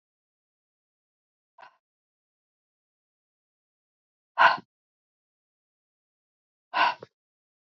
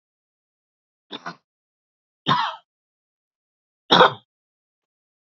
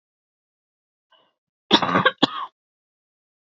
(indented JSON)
{
  "exhalation_length": "7.7 s",
  "exhalation_amplitude": 20402,
  "exhalation_signal_mean_std_ratio": 0.16,
  "three_cough_length": "5.3 s",
  "three_cough_amplitude": 27709,
  "three_cough_signal_mean_std_ratio": 0.21,
  "cough_length": "3.4 s",
  "cough_amplitude": 30151,
  "cough_signal_mean_std_ratio": 0.26,
  "survey_phase": "beta (2021-08-13 to 2022-03-07)",
  "age": "45-64",
  "gender": "Female",
  "wearing_mask": "No",
  "symptom_none": true,
  "smoker_status": "Never smoked",
  "respiratory_condition_asthma": false,
  "respiratory_condition_other": false,
  "recruitment_source": "REACT",
  "submission_delay": "2 days",
  "covid_test_result": "Negative",
  "covid_test_method": "RT-qPCR",
  "influenza_a_test_result": "Negative",
  "influenza_b_test_result": "Negative"
}